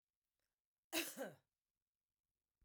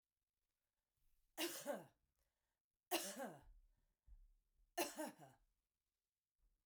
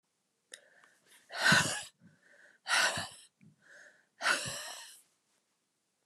cough_length: 2.6 s
cough_amplitude: 1442
cough_signal_mean_std_ratio: 0.26
three_cough_length: 6.7 s
three_cough_amplitude: 1565
three_cough_signal_mean_std_ratio: 0.34
exhalation_length: 6.1 s
exhalation_amplitude: 8117
exhalation_signal_mean_std_ratio: 0.35
survey_phase: beta (2021-08-13 to 2022-03-07)
age: 45-64
gender: Female
wearing_mask: 'No'
symptom_none: true
smoker_status: Never smoked
respiratory_condition_asthma: false
respiratory_condition_other: false
recruitment_source: REACT
submission_delay: 4 days
covid_test_result: Negative
covid_test_method: RT-qPCR
influenza_a_test_result: Unknown/Void
influenza_b_test_result: Unknown/Void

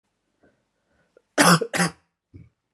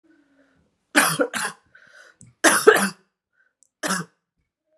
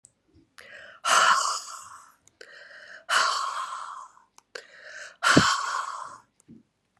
cough_length: 2.7 s
cough_amplitude: 28675
cough_signal_mean_std_ratio: 0.29
three_cough_length: 4.8 s
three_cough_amplitude: 32602
three_cough_signal_mean_std_ratio: 0.33
exhalation_length: 7.0 s
exhalation_amplitude: 25415
exhalation_signal_mean_std_ratio: 0.44
survey_phase: beta (2021-08-13 to 2022-03-07)
age: 18-44
gender: Female
wearing_mask: 'No'
symptom_cough_any: true
symptom_runny_or_blocked_nose: true
symptom_sore_throat: true
symptom_fatigue: true
symptom_headache: true
symptom_onset: 4 days
smoker_status: Never smoked
respiratory_condition_asthma: false
respiratory_condition_other: false
recruitment_source: Test and Trace
submission_delay: 1 day
covid_test_result: Positive
covid_test_method: RT-qPCR
covid_ct_value: 21.5
covid_ct_gene: ORF1ab gene
covid_ct_mean: 22.2
covid_viral_load: 52000 copies/ml
covid_viral_load_category: Low viral load (10K-1M copies/ml)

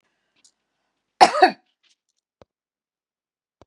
cough_length: 3.7 s
cough_amplitude: 32767
cough_signal_mean_std_ratio: 0.18
survey_phase: beta (2021-08-13 to 2022-03-07)
age: 65+
gender: Female
wearing_mask: 'No'
symptom_none: true
smoker_status: Never smoked
respiratory_condition_asthma: false
respiratory_condition_other: false
recruitment_source: REACT
submission_delay: 1 day
covid_test_result: Negative
covid_test_method: RT-qPCR
influenza_a_test_result: Negative
influenza_b_test_result: Negative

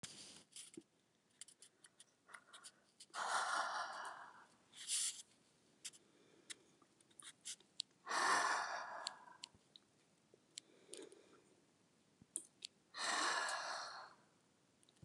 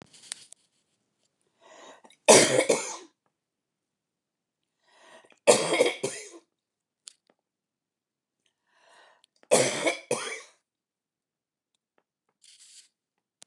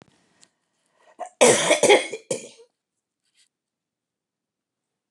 exhalation_length: 15.0 s
exhalation_amplitude: 2753
exhalation_signal_mean_std_ratio: 0.44
three_cough_length: 13.5 s
three_cough_amplitude: 28514
three_cough_signal_mean_std_ratio: 0.25
cough_length: 5.1 s
cough_amplitude: 27559
cough_signal_mean_std_ratio: 0.28
survey_phase: beta (2021-08-13 to 2022-03-07)
age: 65+
gender: Female
wearing_mask: 'No'
symptom_cough_any: true
symptom_runny_or_blocked_nose: true
symptom_fatigue: true
symptom_onset: 13 days
smoker_status: Never smoked
respiratory_condition_asthma: false
respiratory_condition_other: false
recruitment_source: REACT
submission_delay: 2 days
covid_test_result: Negative
covid_test_method: RT-qPCR
influenza_a_test_result: Negative
influenza_b_test_result: Negative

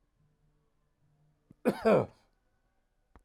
cough_length: 3.2 s
cough_amplitude: 7147
cough_signal_mean_std_ratio: 0.25
survey_phase: alpha (2021-03-01 to 2021-08-12)
age: 45-64
gender: Male
wearing_mask: 'No'
symptom_none: true
smoker_status: Never smoked
respiratory_condition_asthma: false
respiratory_condition_other: false
recruitment_source: REACT
submission_delay: 2 days
covid_test_result: Negative
covid_test_method: RT-qPCR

